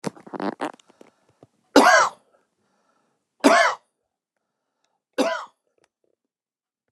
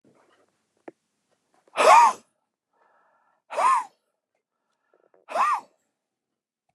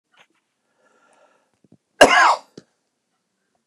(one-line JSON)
{"three_cough_length": "6.9 s", "three_cough_amplitude": 29204, "three_cough_signal_mean_std_ratio": 0.29, "exhalation_length": "6.7 s", "exhalation_amplitude": 24290, "exhalation_signal_mean_std_ratio": 0.28, "cough_length": "3.7 s", "cough_amplitude": 29204, "cough_signal_mean_std_ratio": 0.24, "survey_phase": "beta (2021-08-13 to 2022-03-07)", "age": "65+", "gender": "Male", "wearing_mask": "No", "symptom_none": true, "symptom_onset": "12 days", "smoker_status": "Ex-smoker", "respiratory_condition_asthma": false, "respiratory_condition_other": false, "recruitment_source": "REACT", "submission_delay": "1 day", "covid_test_result": "Negative", "covid_test_method": "RT-qPCR"}